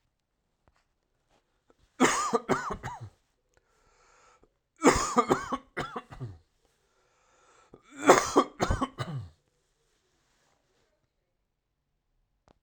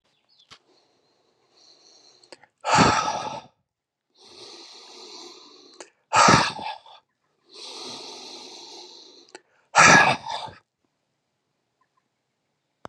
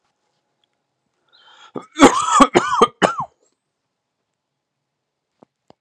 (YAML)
three_cough_length: 12.6 s
three_cough_amplitude: 23787
three_cough_signal_mean_std_ratio: 0.29
exhalation_length: 12.9 s
exhalation_amplitude: 29259
exhalation_signal_mean_std_ratio: 0.29
cough_length: 5.8 s
cough_amplitude: 32768
cough_signal_mean_std_ratio: 0.28
survey_phase: alpha (2021-03-01 to 2021-08-12)
age: 45-64
gender: Male
wearing_mask: 'No'
symptom_cough_any: true
symptom_shortness_of_breath: true
symptom_onset: 6 days
smoker_status: Never smoked
respiratory_condition_asthma: true
respiratory_condition_other: false
recruitment_source: Test and Trace
submission_delay: 2 days
covid_test_result: Positive
covid_test_method: RT-qPCR
covid_ct_value: 15.3
covid_ct_gene: N gene
covid_ct_mean: 15.4
covid_viral_load: 8900000 copies/ml
covid_viral_load_category: High viral load (>1M copies/ml)